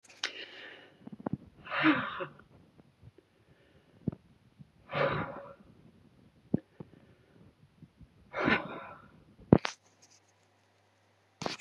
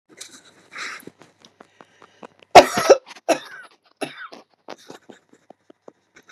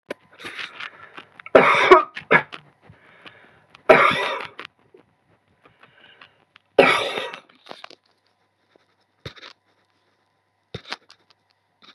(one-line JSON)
{"exhalation_length": "11.6 s", "exhalation_amplitude": 21663, "exhalation_signal_mean_std_ratio": 0.28, "cough_length": "6.3 s", "cough_amplitude": 32768, "cough_signal_mean_std_ratio": 0.2, "three_cough_length": "11.9 s", "three_cough_amplitude": 32768, "three_cough_signal_mean_std_ratio": 0.27, "survey_phase": "beta (2021-08-13 to 2022-03-07)", "age": "65+", "gender": "Female", "wearing_mask": "No", "symptom_none": true, "smoker_status": "Ex-smoker", "respiratory_condition_asthma": true, "respiratory_condition_other": false, "recruitment_source": "REACT", "submission_delay": "1 day", "covid_test_result": "Negative", "covid_test_method": "RT-qPCR", "influenza_a_test_result": "Negative", "influenza_b_test_result": "Negative"}